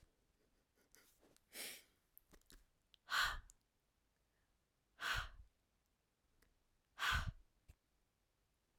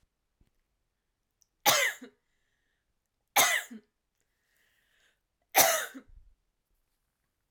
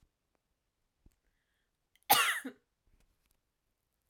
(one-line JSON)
{"exhalation_length": "8.8 s", "exhalation_amplitude": 1615, "exhalation_signal_mean_std_ratio": 0.29, "three_cough_length": "7.5 s", "three_cough_amplitude": 16915, "three_cough_signal_mean_std_ratio": 0.26, "cough_length": "4.1 s", "cough_amplitude": 10201, "cough_signal_mean_std_ratio": 0.21, "survey_phase": "alpha (2021-03-01 to 2021-08-12)", "age": "18-44", "gender": "Female", "wearing_mask": "No", "symptom_none": true, "smoker_status": "Never smoked", "respiratory_condition_asthma": false, "respiratory_condition_other": false, "recruitment_source": "REACT", "submission_delay": "2 days", "covid_test_result": "Negative", "covid_test_method": "RT-qPCR"}